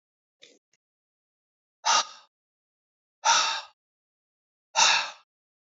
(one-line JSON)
{"exhalation_length": "5.6 s", "exhalation_amplitude": 14665, "exhalation_signal_mean_std_ratio": 0.31, "survey_phase": "beta (2021-08-13 to 2022-03-07)", "age": "45-64", "gender": "Male", "wearing_mask": "No", "symptom_cough_any": true, "symptom_runny_or_blocked_nose": true, "symptom_fatigue": true, "symptom_fever_high_temperature": true, "symptom_headache": true, "symptom_change_to_sense_of_smell_or_taste": true, "symptom_loss_of_taste": true, "symptom_onset": "2 days", "smoker_status": "Never smoked", "respiratory_condition_asthma": false, "respiratory_condition_other": false, "recruitment_source": "Test and Trace", "submission_delay": "1 day", "covid_test_result": "Positive", "covid_test_method": "RT-qPCR"}